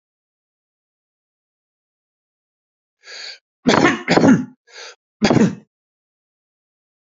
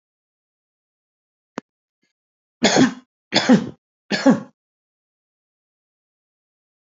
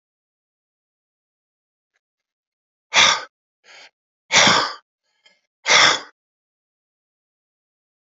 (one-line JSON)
{"cough_length": "7.1 s", "cough_amplitude": 30723, "cough_signal_mean_std_ratio": 0.3, "three_cough_length": "6.9 s", "three_cough_amplitude": 29215, "three_cough_signal_mean_std_ratio": 0.26, "exhalation_length": "8.1 s", "exhalation_amplitude": 30783, "exhalation_signal_mean_std_ratio": 0.27, "survey_phase": "alpha (2021-03-01 to 2021-08-12)", "age": "65+", "gender": "Male", "wearing_mask": "No", "symptom_none": true, "smoker_status": "Ex-smoker", "respiratory_condition_asthma": false, "respiratory_condition_other": false, "recruitment_source": "REACT", "submission_delay": "1 day", "covid_test_result": "Negative", "covid_test_method": "RT-qPCR"}